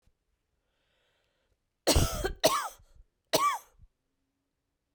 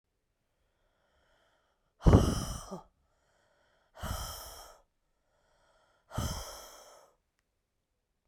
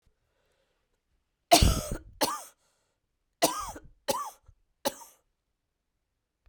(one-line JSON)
{"cough_length": "4.9 s", "cough_amplitude": 11214, "cough_signal_mean_std_ratio": 0.33, "exhalation_length": "8.3 s", "exhalation_amplitude": 13556, "exhalation_signal_mean_std_ratio": 0.23, "three_cough_length": "6.5 s", "three_cough_amplitude": 17746, "three_cough_signal_mean_std_ratio": 0.27, "survey_phase": "beta (2021-08-13 to 2022-03-07)", "age": "45-64", "gender": "Female", "wearing_mask": "No", "symptom_runny_or_blocked_nose": true, "symptom_fatigue": true, "symptom_onset": "4 days", "smoker_status": "Never smoked", "respiratory_condition_asthma": false, "respiratory_condition_other": false, "recruitment_source": "Test and Trace", "submission_delay": "2 days", "covid_test_result": "Positive", "covid_test_method": "ePCR"}